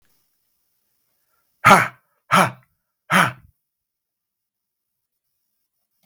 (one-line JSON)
{"exhalation_length": "6.1 s", "exhalation_amplitude": 32768, "exhalation_signal_mean_std_ratio": 0.23, "survey_phase": "beta (2021-08-13 to 2022-03-07)", "age": "65+", "gender": "Male", "wearing_mask": "No", "symptom_none": true, "smoker_status": "Never smoked", "respiratory_condition_asthma": false, "respiratory_condition_other": false, "recruitment_source": "REACT", "submission_delay": "2 days", "covid_test_result": "Negative", "covid_test_method": "RT-qPCR", "influenza_a_test_result": "Unknown/Void", "influenza_b_test_result": "Unknown/Void"}